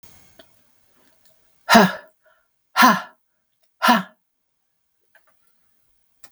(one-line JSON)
{"exhalation_length": "6.3 s", "exhalation_amplitude": 32768, "exhalation_signal_mean_std_ratio": 0.26, "survey_phase": "beta (2021-08-13 to 2022-03-07)", "age": "65+", "gender": "Female", "wearing_mask": "No", "symptom_none": true, "smoker_status": "Ex-smoker", "respiratory_condition_asthma": false, "respiratory_condition_other": false, "recruitment_source": "REACT", "submission_delay": "8 days", "covid_test_result": "Negative", "covid_test_method": "RT-qPCR"}